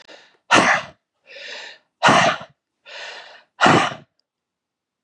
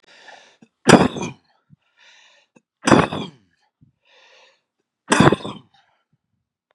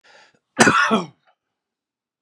{"exhalation_length": "5.0 s", "exhalation_amplitude": 30462, "exhalation_signal_mean_std_ratio": 0.38, "three_cough_length": "6.7 s", "three_cough_amplitude": 32768, "three_cough_signal_mean_std_ratio": 0.26, "cough_length": "2.2 s", "cough_amplitude": 32768, "cough_signal_mean_std_ratio": 0.34, "survey_phase": "beta (2021-08-13 to 2022-03-07)", "age": "45-64", "gender": "Male", "wearing_mask": "No", "symptom_none": true, "smoker_status": "Ex-smoker", "respiratory_condition_asthma": false, "respiratory_condition_other": false, "recruitment_source": "REACT", "submission_delay": "1 day", "covid_test_result": "Negative", "covid_test_method": "RT-qPCR", "influenza_a_test_result": "Negative", "influenza_b_test_result": "Negative"}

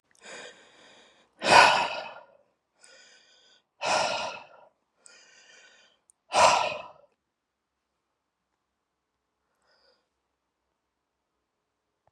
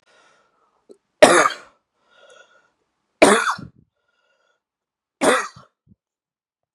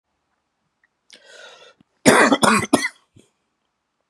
{"exhalation_length": "12.1 s", "exhalation_amplitude": 24557, "exhalation_signal_mean_std_ratio": 0.25, "three_cough_length": "6.7 s", "three_cough_amplitude": 32768, "three_cough_signal_mean_std_ratio": 0.26, "cough_length": "4.1 s", "cough_amplitude": 32768, "cough_signal_mean_std_ratio": 0.32, "survey_phase": "beta (2021-08-13 to 2022-03-07)", "age": "45-64", "gender": "Male", "wearing_mask": "No", "symptom_cough_any": true, "symptom_sore_throat": true, "symptom_fatigue": true, "symptom_change_to_sense_of_smell_or_taste": true, "symptom_onset": "11 days", "smoker_status": "Never smoked", "respiratory_condition_asthma": false, "respiratory_condition_other": false, "recruitment_source": "REACT", "submission_delay": "1 day", "covid_test_result": "Negative", "covid_test_method": "RT-qPCR", "influenza_a_test_result": "Negative", "influenza_b_test_result": "Negative"}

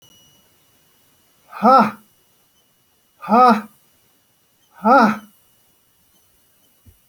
{"exhalation_length": "7.1 s", "exhalation_amplitude": 28246, "exhalation_signal_mean_std_ratio": 0.3, "survey_phase": "alpha (2021-03-01 to 2021-08-12)", "age": "45-64", "gender": "Male", "wearing_mask": "No", "symptom_none": true, "smoker_status": "Never smoked", "respiratory_condition_asthma": false, "respiratory_condition_other": false, "recruitment_source": "REACT", "submission_delay": "1 day", "covid_test_result": "Negative", "covid_test_method": "RT-qPCR"}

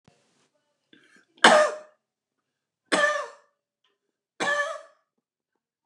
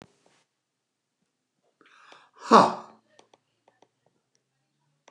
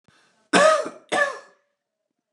{"three_cough_length": "5.9 s", "three_cough_amplitude": 29203, "three_cough_signal_mean_std_ratio": 0.29, "exhalation_length": "5.1 s", "exhalation_amplitude": 27533, "exhalation_signal_mean_std_ratio": 0.16, "cough_length": "2.3 s", "cough_amplitude": 27444, "cough_signal_mean_std_ratio": 0.39, "survey_phase": "beta (2021-08-13 to 2022-03-07)", "age": "65+", "gender": "Male", "wearing_mask": "No", "symptom_none": true, "smoker_status": "Never smoked", "respiratory_condition_asthma": false, "respiratory_condition_other": false, "recruitment_source": "REACT", "submission_delay": "2 days", "covid_test_result": "Negative", "covid_test_method": "RT-qPCR", "influenza_a_test_result": "Negative", "influenza_b_test_result": "Negative"}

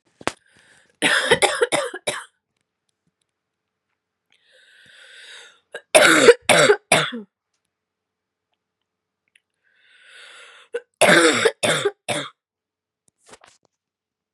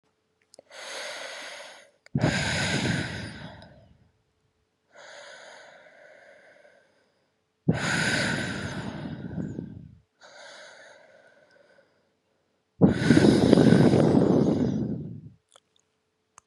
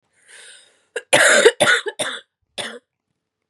{"three_cough_length": "14.3 s", "three_cough_amplitude": 32768, "three_cough_signal_mean_std_ratio": 0.32, "exhalation_length": "16.5 s", "exhalation_amplitude": 32445, "exhalation_signal_mean_std_ratio": 0.42, "cough_length": "3.5 s", "cough_amplitude": 32767, "cough_signal_mean_std_ratio": 0.39, "survey_phase": "beta (2021-08-13 to 2022-03-07)", "age": "18-44", "gender": "Female", "wearing_mask": "No", "symptom_cough_any": true, "symptom_runny_or_blocked_nose": true, "symptom_shortness_of_breath": true, "symptom_headache": true, "symptom_change_to_sense_of_smell_or_taste": true, "symptom_loss_of_taste": true, "symptom_onset": "2 days", "smoker_status": "Ex-smoker", "respiratory_condition_asthma": false, "respiratory_condition_other": false, "recruitment_source": "Test and Trace", "submission_delay": "2 days", "covid_test_result": "Positive", "covid_test_method": "LFT"}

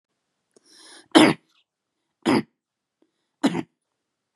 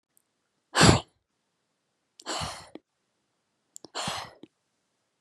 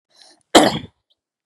{"three_cough_length": "4.4 s", "three_cough_amplitude": 30773, "three_cough_signal_mean_std_ratio": 0.25, "exhalation_length": "5.2 s", "exhalation_amplitude": 27640, "exhalation_signal_mean_std_ratio": 0.23, "cough_length": "1.5 s", "cough_amplitude": 32768, "cough_signal_mean_std_ratio": 0.28, "survey_phase": "beta (2021-08-13 to 2022-03-07)", "age": "18-44", "gender": "Female", "wearing_mask": "No", "symptom_none": true, "smoker_status": "Never smoked", "respiratory_condition_asthma": true, "respiratory_condition_other": false, "recruitment_source": "REACT", "submission_delay": "2 days", "covid_test_result": "Negative", "covid_test_method": "RT-qPCR", "influenza_a_test_result": "Negative", "influenza_b_test_result": "Negative"}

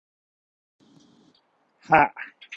{"exhalation_length": "2.6 s", "exhalation_amplitude": 26015, "exhalation_signal_mean_std_ratio": 0.21, "survey_phase": "beta (2021-08-13 to 2022-03-07)", "age": "18-44", "gender": "Male", "wearing_mask": "No", "symptom_none": true, "smoker_status": "Ex-smoker", "respiratory_condition_asthma": false, "respiratory_condition_other": false, "recruitment_source": "REACT", "submission_delay": "2 days", "covid_test_result": "Negative", "covid_test_method": "RT-qPCR", "influenza_a_test_result": "Negative", "influenza_b_test_result": "Negative"}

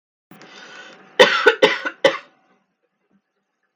{"cough_length": "3.8 s", "cough_amplitude": 32768, "cough_signal_mean_std_ratio": 0.3, "survey_phase": "beta (2021-08-13 to 2022-03-07)", "age": "18-44", "gender": "Female", "wearing_mask": "No", "symptom_none": true, "symptom_onset": "13 days", "smoker_status": "Never smoked", "respiratory_condition_asthma": false, "respiratory_condition_other": false, "recruitment_source": "REACT", "submission_delay": "2 days", "covid_test_result": "Negative", "covid_test_method": "RT-qPCR"}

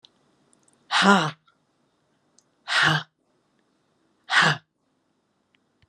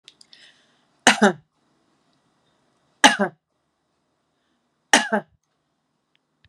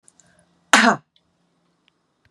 {"exhalation_length": "5.9 s", "exhalation_amplitude": 29911, "exhalation_signal_mean_std_ratio": 0.31, "three_cough_length": "6.5 s", "three_cough_amplitude": 32768, "three_cough_signal_mean_std_ratio": 0.21, "cough_length": "2.3 s", "cough_amplitude": 32768, "cough_signal_mean_std_ratio": 0.24, "survey_phase": "beta (2021-08-13 to 2022-03-07)", "age": "65+", "gender": "Female", "wearing_mask": "No", "symptom_none": true, "smoker_status": "Current smoker (e-cigarettes or vapes only)", "respiratory_condition_asthma": false, "respiratory_condition_other": false, "recruitment_source": "REACT", "submission_delay": "1 day", "covid_test_result": "Negative", "covid_test_method": "RT-qPCR", "influenza_a_test_result": "Negative", "influenza_b_test_result": "Negative"}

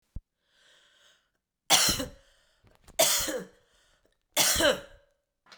{"three_cough_length": "5.6 s", "three_cough_amplitude": 16421, "three_cough_signal_mean_std_ratio": 0.37, "survey_phase": "beta (2021-08-13 to 2022-03-07)", "age": "45-64", "gender": "Female", "wearing_mask": "No", "symptom_cough_any": true, "symptom_runny_or_blocked_nose": true, "symptom_sore_throat": true, "symptom_fatigue": true, "symptom_change_to_sense_of_smell_or_taste": true, "symptom_loss_of_taste": true, "symptom_onset": "6 days", "smoker_status": "Ex-smoker", "respiratory_condition_asthma": false, "respiratory_condition_other": false, "recruitment_source": "Test and Trace", "submission_delay": "2 days", "covid_test_result": "Positive", "covid_test_method": "RT-qPCR", "covid_ct_value": 17.3, "covid_ct_gene": "ORF1ab gene", "covid_ct_mean": 17.7, "covid_viral_load": "1500000 copies/ml", "covid_viral_load_category": "High viral load (>1M copies/ml)"}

